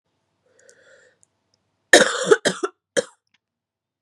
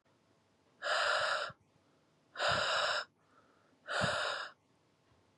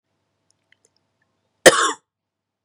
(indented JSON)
{
  "three_cough_length": "4.0 s",
  "three_cough_amplitude": 32768,
  "three_cough_signal_mean_std_ratio": 0.25,
  "exhalation_length": "5.4 s",
  "exhalation_amplitude": 3426,
  "exhalation_signal_mean_std_ratio": 0.53,
  "cough_length": "2.6 s",
  "cough_amplitude": 32768,
  "cough_signal_mean_std_ratio": 0.2,
  "survey_phase": "beta (2021-08-13 to 2022-03-07)",
  "age": "18-44",
  "gender": "Female",
  "wearing_mask": "No",
  "symptom_cough_any": true,
  "symptom_runny_or_blocked_nose": true,
  "symptom_shortness_of_breath": true,
  "symptom_sore_throat": true,
  "symptom_fatigue": true,
  "symptom_fever_high_temperature": true,
  "symptom_headache": true,
  "symptom_change_to_sense_of_smell_or_taste": true,
  "symptom_loss_of_taste": true,
  "symptom_other": true,
  "smoker_status": "Never smoked",
  "respiratory_condition_asthma": false,
  "respiratory_condition_other": false,
  "recruitment_source": "Test and Trace",
  "submission_delay": "1 day",
  "covid_test_result": "Positive",
  "covid_test_method": "LFT"
}